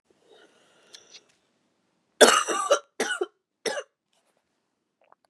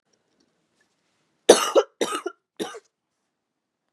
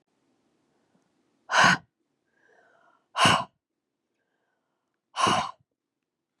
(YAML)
three_cough_length: 5.3 s
three_cough_amplitude: 29241
three_cough_signal_mean_std_ratio: 0.26
cough_length: 3.9 s
cough_amplitude: 32768
cough_signal_mean_std_ratio: 0.23
exhalation_length: 6.4 s
exhalation_amplitude: 21285
exhalation_signal_mean_std_ratio: 0.28
survey_phase: beta (2021-08-13 to 2022-03-07)
age: 45-64
gender: Female
wearing_mask: 'No'
symptom_cough_any: true
symptom_runny_or_blocked_nose: true
symptom_shortness_of_breath: true
symptom_fatigue: true
symptom_onset: 2 days
smoker_status: Never smoked
respiratory_condition_asthma: false
respiratory_condition_other: false
recruitment_source: Test and Trace
submission_delay: 1 day
covid_test_result: Positive
covid_test_method: RT-qPCR
covid_ct_value: 22.2
covid_ct_gene: N gene
covid_ct_mean: 22.2
covid_viral_load: 51000 copies/ml
covid_viral_load_category: Low viral load (10K-1M copies/ml)